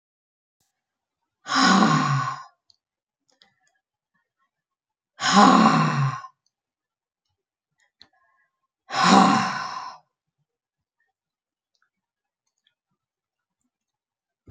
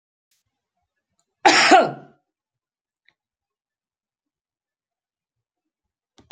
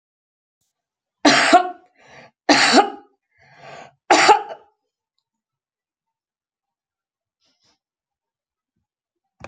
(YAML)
exhalation_length: 14.5 s
exhalation_amplitude: 27373
exhalation_signal_mean_std_ratio: 0.32
cough_length: 6.3 s
cough_amplitude: 32767
cough_signal_mean_std_ratio: 0.21
three_cough_length: 9.5 s
three_cough_amplitude: 32071
three_cough_signal_mean_std_ratio: 0.27
survey_phase: beta (2021-08-13 to 2022-03-07)
age: 65+
gender: Female
wearing_mask: 'No'
symptom_runny_or_blocked_nose: true
smoker_status: Ex-smoker
respiratory_condition_asthma: false
respiratory_condition_other: false
recruitment_source: REACT
submission_delay: 1 day
covid_test_result: Negative
covid_test_method: RT-qPCR